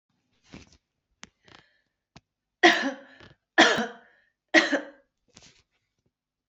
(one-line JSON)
{"three_cough_length": "6.5 s", "three_cough_amplitude": 23334, "three_cough_signal_mean_std_ratio": 0.26, "survey_phase": "beta (2021-08-13 to 2022-03-07)", "age": "45-64", "gender": "Female", "wearing_mask": "No", "symptom_runny_or_blocked_nose": true, "symptom_shortness_of_breath": true, "symptom_sore_throat": true, "symptom_fatigue": true, "symptom_fever_high_temperature": true, "symptom_headache": true, "symptom_onset": "6 days", "smoker_status": "Never smoked", "respiratory_condition_asthma": false, "respiratory_condition_other": false, "recruitment_source": "Test and Trace", "submission_delay": "2 days", "covid_test_result": "Positive", "covid_test_method": "LAMP"}